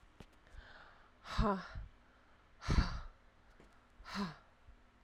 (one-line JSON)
{"exhalation_length": "5.0 s", "exhalation_amplitude": 4735, "exhalation_signal_mean_std_ratio": 0.38, "survey_phase": "alpha (2021-03-01 to 2021-08-12)", "age": "18-44", "gender": "Female", "wearing_mask": "No", "symptom_diarrhoea": true, "symptom_fever_high_temperature": true, "symptom_change_to_sense_of_smell_or_taste": true, "symptom_loss_of_taste": true, "symptom_onset": "2 days", "smoker_status": "Current smoker (1 to 10 cigarettes per day)", "respiratory_condition_asthma": false, "respiratory_condition_other": false, "recruitment_source": "Test and Trace", "submission_delay": "1 day", "covid_test_result": "Positive", "covid_test_method": "RT-qPCR"}